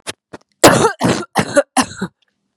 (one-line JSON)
{"cough_length": "2.6 s", "cough_amplitude": 32768, "cough_signal_mean_std_ratio": 0.44, "survey_phase": "beta (2021-08-13 to 2022-03-07)", "age": "18-44", "gender": "Female", "wearing_mask": "No", "symptom_cough_any": true, "symptom_runny_or_blocked_nose": true, "symptom_fatigue": true, "symptom_fever_high_temperature": true, "symptom_headache": true, "symptom_other": true, "symptom_onset": "4 days", "smoker_status": "Never smoked", "respiratory_condition_asthma": true, "respiratory_condition_other": false, "recruitment_source": "Test and Trace", "submission_delay": "2 days", "covid_test_result": "Positive", "covid_test_method": "RT-qPCR", "covid_ct_value": 21.2, "covid_ct_gene": "ORF1ab gene"}